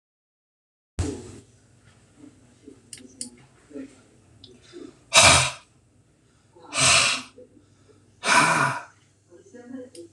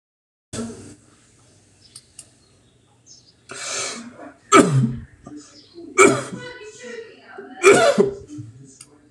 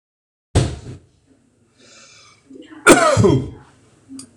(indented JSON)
{
  "exhalation_length": "10.1 s",
  "exhalation_amplitude": 26027,
  "exhalation_signal_mean_std_ratio": 0.33,
  "three_cough_length": "9.1 s",
  "three_cough_amplitude": 26028,
  "three_cough_signal_mean_std_ratio": 0.35,
  "cough_length": "4.4 s",
  "cough_amplitude": 26028,
  "cough_signal_mean_std_ratio": 0.36,
  "survey_phase": "beta (2021-08-13 to 2022-03-07)",
  "age": "65+",
  "gender": "Male",
  "wearing_mask": "No",
  "symptom_none": true,
  "smoker_status": "Ex-smoker",
  "respiratory_condition_asthma": false,
  "respiratory_condition_other": false,
  "recruitment_source": "REACT",
  "submission_delay": "3 days",
  "covid_test_result": "Negative",
  "covid_test_method": "RT-qPCR",
  "influenza_a_test_result": "Unknown/Void",
  "influenza_b_test_result": "Unknown/Void"
}